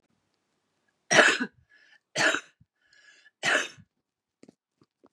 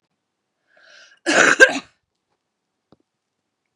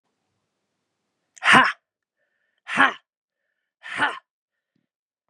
three_cough_length: 5.1 s
three_cough_amplitude: 26993
three_cough_signal_mean_std_ratio: 0.29
cough_length: 3.8 s
cough_amplitude: 32768
cough_signal_mean_std_ratio: 0.25
exhalation_length: 5.3 s
exhalation_amplitude: 31600
exhalation_signal_mean_std_ratio: 0.25
survey_phase: beta (2021-08-13 to 2022-03-07)
age: 18-44
gender: Female
wearing_mask: 'No'
symptom_sore_throat: true
symptom_fatigue: true
symptom_headache: true
symptom_onset: 6 days
smoker_status: Ex-smoker
respiratory_condition_asthma: true
respiratory_condition_other: false
recruitment_source: Test and Trace
submission_delay: 1 day
covid_test_result: Positive
covid_test_method: RT-qPCR
covid_ct_value: 22.4
covid_ct_gene: N gene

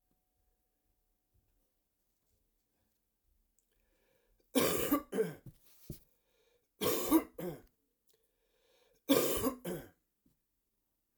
three_cough_length: 11.2 s
three_cough_amplitude: 5842
three_cough_signal_mean_std_ratio: 0.31
survey_phase: alpha (2021-03-01 to 2021-08-12)
age: 65+
gender: Male
wearing_mask: 'No'
symptom_cough_any: true
symptom_headache: true
symptom_onset: 3 days
smoker_status: Never smoked
respiratory_condition_asthma: false
respiratory_condition_other: false
recruitment_source: Test and Trace
submission_delay: 1 day
covid_test_result: Positive
covid_test_method: RT-qPCR
covid_ct_value: 13.9
covid_ct_gene: ORF1ab gene
covid_ct_mean: 14.8
covid_viral_load: 14000000 copies/ml
covid_viral_load_category: High viral load (>1M copies/ml)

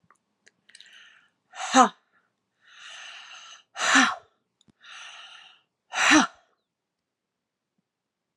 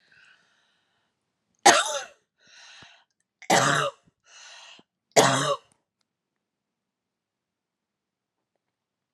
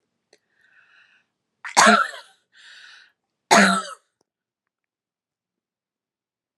exhalation_length: 8.4 s
exhalation_amplitude: 19479
exhalation_signal_mean_std_ratio: 0.27
three_cough_length: 9.1 s
three_cough_amplitude: 32764
three_cough_signal_mean_std_ratio: 0.26
cough_length: 6.6 s
cough_amplitude: 31785
cough_signal_mean_std_ratio: 0.25
survey_phase: alpha (2021-03-01 to 2021-08-12)
age: 45-64
gender: Female
wearing_mask: 'No'
symptom_fatigue: true
symptom_headache: true
smoker_status: Never smoked
respiratory_condition_asthma: false
respiratory_condition_other: false
recruitment_source: REACT
submission_delay: 2 days
covid_test_result: Negative
covid_test_method: RT-qPCR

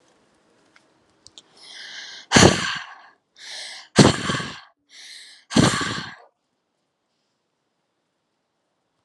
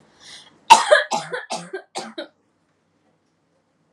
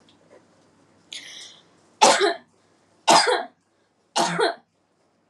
exhalation_length: 9.0 s
exhalation_amplitude: 32768
exhalation_signal_mean_std_ratio: 0.28
cough_length: 3.9 s
cough_amplitude: 32768
cough_signal_mean_std_ratio: 0.27
three_cough_length: 5.3 s
three_cough_amplitude: 28224
three_cough_signal_mean_std_ratio: 0.35
survey_phase: alpha (2021-03-01 to 2021-08-12)
age: 18-44
gender: Female
wearing_mask: 'No'
symptom_abdominal_pain: true
symptom_diarrhoea: true
smoker_status: Never smoked
respiratory_condition_asthma: false
respiratory_condition_other: false
recruitment_source: REACT
submission_delay: 2 days
covid_test_result: Negative
covid_test_method: RT-qPCR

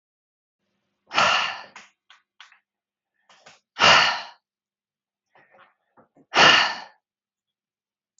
exhalation_length: 8.2 s
exhalation_amplitude: 27392
exhalation_signal_mean_std_ratio: 0.29
survey_phase: beta (2021-08-13 to 2022-03-07)
age: 18-44
gender: Female
wearing_mask: 'No'
symptom_none: true
smoker_status: Current smoker (1 to 10 cigarettes per day)
respiratory_condition_asthma: false
respiratory_condition_other: false
recruitment_source: REACT
submission_delay: 1 day
covid_test_result: Negative
covid_test_method: RT-qPCR
influenza_a_test_result: Negative
influenza_b_test_result: Negative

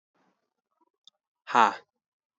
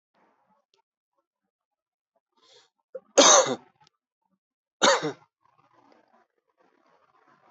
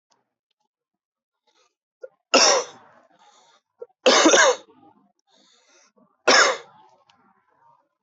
exhalation_length: 2.4 s
exhalation_amplitude: 19374
exhalation_signal_mean_std_ratio: 0.19
cough_length: 7.5 s
cough_amplitude: 22101
cough_signal_mean_std_ratio: 0.22
three_cough_length: 8.0 s
three_cough_amplitude: 25558
three_cough_signal_mean_std_ratio: 0.3
survey_phase: alpha (2021-03-01 to 2021-08-12)
age: 18-44
gender: Male
wearing_mask: 'No'
symptom_cough_any: true
symptom_new_continuous_cough: true
symptom_fatigue: true
symptom_fever_high_temperature: true
symptom_headache: true
symptom_onset: 3 days
smoker_status: Ex-smoker
respiratory_condition_asthma: false
respiratory_condition_other: false
recruitment_source: Test and Trace
submission_delay: 1 day
covid_test_result: Positive
covid_test_method: RT-qPCR
covid_ct_value: 25.9
covid_ct_gene: ORF1ab gene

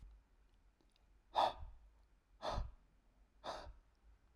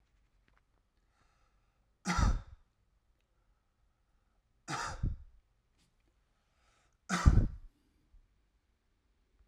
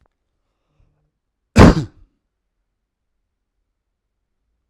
exhalation_length: 4.4 s
exhalation_amplitude: 2576
exhalation_signal_mean_std_ratio: 0.34
three_cough_length: 9.5 s
three_cough_amplitude: 12293
three_cough_signal_mean_std_ratio: 0.24
cough_length: 4.7 s
cough_amplitude: 32768
cough_signal_mean_std_ratio: 0.17
survey_phase: alpha (2021-03-01 to 2021-08-12)
age: 18-44
gender: Male
wearing_mask: 'No'
symptom_none: true
smoker_status: Current smoker (11 or more cigarettes per day)
respiratory_condition_asthma: false
respiratory_condition_other: false
recruitment_source: REACT
submission_delay: 1 day
covid_test_result: Negative
covid_test_method: RT-qPCR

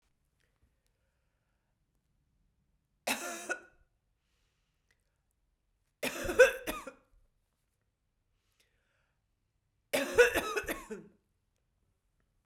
three_cough_length: 12.5 s
three_cough_amplitude: 12183
three_cough_signal_mean_std_ratio: 0.23
survey_phase: beta (2021-08-13 to 2022-03-07)
age: 45-64
gender: Female
wearing_mask: 'No'
symptom_cough_any: true
symptom_runny_or_blocked_nose: true
symptom_shortness_of_breath: true
symptom_sore_throat: true
symptom_fatigue: true
symptom_fever_high_temperature: true
symptom_headache: true
symptom_change_to_sense_of_smell_or_taste: true
symptom_other: true
symptom_onset: 6 days
smoker_status: Never smoked
respiratory_condition_asthma: false
respiratory_condition_other: false
recruitment_source: Test and Trace
submission_delay: 2 days
covid_test_result: Positive
covid_test_method: ePCR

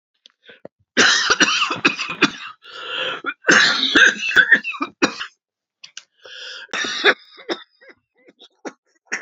cough_length: 9.2 s
cough_amplitude: 32767
cough_signal_mean_std_ratio: 0.46
survey_phase: alpha (2021-03-01 to 2021-08-12)
age: 45-64
gender: Female
wearing_mask: 'No'
symptom_cough_any: true
symptom_shortness_of_breath: true
symptom_fatigue: true
symptom_headache: true
smoker_status: Never smoked
respiratory_condition_asthma: true
respiratory_condition_other: false
recruitment_source: Test and Trace
submission_delay: 2 days
covid_test_result: Positive
covid_test_method: RT-qPCR
covid_ct_value: 12.3
covid_ct_gene: ORF1ab gene
covid_ct_mean: 12.8
covid_viral_load: 62000000 copies/ml
covid_viral_load_category: High viral load (>1M copies/ml)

